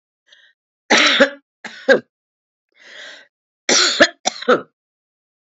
{"cough_length": "5.5 s", "cough_amplitude": 29512, "cough_signal_mean_std_ratio": 0.35, "survey_phase": "alpha (2021-03-01 to 2021-08-12)", "age": "65+", "gender": "Female", "wearing_mask": "No", "symptom_cough_any": true, "symptom_fatigue": true, "symptom_headache": true, "symptom_change_to_sense_of_smell_or_taste": true, "symptom_loss_of_taste": true, "smoker_status": "Never smoked", "respiratory_condition_asthma": false, "respiratory_condition_other": false, "recruitment_source": "Test and Trace", "submission_delay": "2 days", "covid_test_result": "Positive", "covid_test_method": "LFT"}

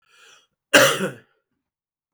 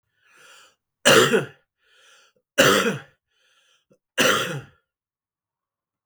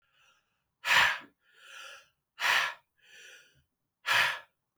{"cough_length": "2.1 s", "cough_amplitude": 32768, "cough_signal_mean_std_ratio": 0.29, "three_cough_length": "6.1 s", "three_cough_amplitude": 32766, "three_cough_signal_mean_std_ratio": 0.33, "exhalation_length": "4.8 s", "exhalation_amplitude": 9593, "exhalation_signal_mean_std_ratio": 0.37, "survey_phase": "beta (2021-08-13 to 2022-03-07)", "age": "45-64", "gender": "Male", "wearing_mask": "No", "symptom_cough_any": true, "symptom_runny_or_blocked_nose": true, "symptom_shortness_of_breath": true, "symptom_sore_throat": true, "symptom_fatigue": true, "symptom_headache": true, "symptom_onset": "5 days", "smoker_status": "Never smoked", "respiratory_condition_asthma": false, "respiratory_condition_other": false, "recruitment_source": "Test and Trace", "submission_delay": "2 days", "covid_test_result": "Positive", "covid_test_method": "RT-qPCR", "covid_ct_value": 17.1, "covid_ct_gene": "ORF1ab gene", "covid_ct_mean": 17.8, "covid_viral_load": "1500000 copies/ml", "covid_viral_load_category": "High viral load (>1M copies/ml)"}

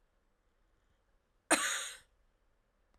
{"cough_length": "3.0 s", "cough_amplitude": 6928, "cough_signal_mean_std_ratio": 0.26, "survey_phase": "beta (2021-08-13 to 2022-03-07)", "age": "45-64", "gender": "Female", "wearing_mask": "No", "symptom_cough_any": true, "symptom_runny_or_blocked_nose": true, "symptom_sore_throat": true, "symptom_diarrhoea": true, "symptom_fatigue": true, "symptom_fever_high_temperature": true, "symptom_headache": true, "symptom_change_to_sense_of_smell_or_taste": true, "symptom_loss_of_taste": true, "symptom_onset": "5 days", "smoker_status": "Never smoked", "respiratory_condition_asthma": false, "respiratory_condition_other": false, "recruitment_source": "Test and Trace", "submission_delay": "4 days", "covid_test_result": "Positive", "covid_test_method": "RT-qPCR", "covid_ct_value": 23.4, "covid_ct_gene": "S gene", "covid_ct_mean": 23.8, "covid_viral_load": "16000 copies/ml", "covid_viral_load_category": "Low viral load (10K-1M copies/ml)"}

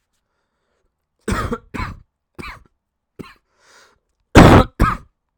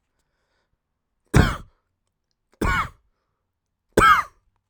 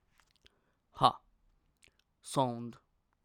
{"cough_length": "5.4 s", "cough_amplitude": 32768, "cough_signal_mean_std_ratio": 0.27, "three_cough_length": "4.7 s", "three_cough_amplitude": 27061, "three_cough_signal_mean_std_ratio": 0.29, "exhalation_length": "3.2 s", "exhalation_amplitude": 11889, "exhalation_signal_mean_std_ratio": 0.25, "survey_phase": "alpha (2021-03-01 to 2021-08-12)", "age": "18-44", "gender": "Male", "wearing_mask": "No", "symptom_prefer_not_to_say": true, "symptom_onset": "12 days", "smoker_status": "Never smoked", "respiratory_condition_asthma": false, "respiratory_condition_other": false, "recruitment_source": "Test and Trace", "submission_delay": "2 days", "covid_test_result": "Positive", "covid_test_method": "RT-qPCR", "covid_ct_value": 25.9, "covid_ct_gene": "ORF1ab gene", "covid_ct_mean": 26.2, "covid_viral_load": "2500 copies/ml", "covid_viral_load_category": "Minimal viral load (< 10K copies/ml)"}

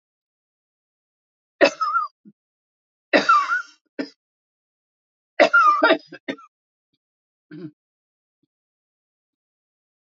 {"three_cough_length": "10.1 s", "three_cough_amplitude": 26970, "three_cough_signal_mean_std_ratio": 0.29, "survey_phase": "alpha (2021-03-01 to 2021-08-12)", "age": "65+", "gender": "Female", "wearing_mask": "No", "symptom_none": true, "smoker_status": "Ex-smoker", "respiratory_condition_asthma": true, "respiratory_condition_other": false, "recruitment_source": "REACT", "submission_delay": "2 days", "covid_test_result": "Negative", "covid_test_method": "RT-qPCR"}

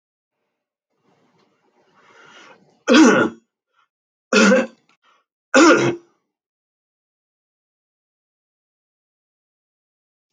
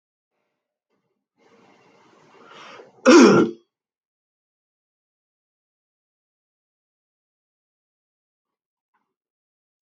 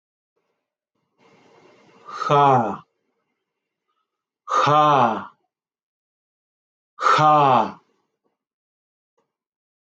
{"three_cough_length": "10.3 s", "three_cough_amplitude": 29411, "three_cough_signal_mean_std_ratio": 0.27, "cough_length": "9.8 s", "cough_amplitude": 29658, "cough_signal_mean_std_ratio": 0.18, "exhalation_length": "10.0 s", "exhalation_amplitude": 22692, "exhalation_signal_mean_std_ratio": 0.36, "survey_phase": "beta (2021-08-13 to 2022-03-07)", "age": "45-64", "gender": "Male", "wearing_mask": "Yes", "symptom_none": true, "smoker_status": "Ex-smoker", "respiratory_condition_asthma": false, "respiratory_condition_other": false, "recruitment_source": "REACT", "submission_delay": "2 days", "covid_test_result": "Negative", "covid_test_method": "RT-qPCR", "influenza_a_test_result": "Negative", "influenza_b_test_result": "Negative"}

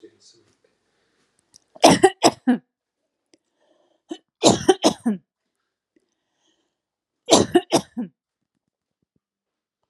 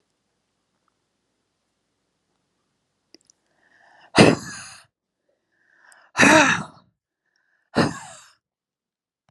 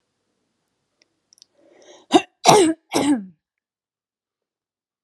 {"three_cough_length": "9.9 s", "three_cough_amplitude": 32314, "three_cough_signal_mean_std_ratio": 0.26, "exhalation_length": "9.3 s", "exhalation_amplitude": 32768, "exhalation_signal_mean_std_ratio": 0.23, "cough_length": "5.0 s", "cough_amplitude": 32768, "cough_signal_mean_std_ratio": 0.27, "survey_phase": "beta (2021-08-13 to 2022-03-07)", "age": "45-64", "gender": "Female", "wearing_mask": "No", "symptom_none": true, "smoker_status": "Never smoked", "respiratory_condition_asthma": false, "respiratory_condition_other": false, "recruitment_source": "REACT", "submission_delay": "1 day", "covid_test_result": "Negative", "covid_test_method": "RT-qPCR"}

